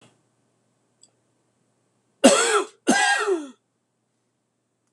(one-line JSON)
{"cough_length": "4.9 s", "cough_amplitude": 26028, "cough_signal_mean_std_ratio": 0.34, "survey_phase": "beta (2021-08-13 to 2022-03-07)", "age": "65+", "gender": "Male", "wearing_mask": "No", "symptom_none": true, "smoker_status": "Never smoked", "respiratory_condition_asthma": false, "respiratory_condition_other": false, "recruitment_source": "REACT", "submission_delay": "2 days", "covid_test_result": "Negative", "covid_test_method": "RT-qPCR", "influenza_a_test_result": "Negative", "influenza_b_test_result": "Negative"}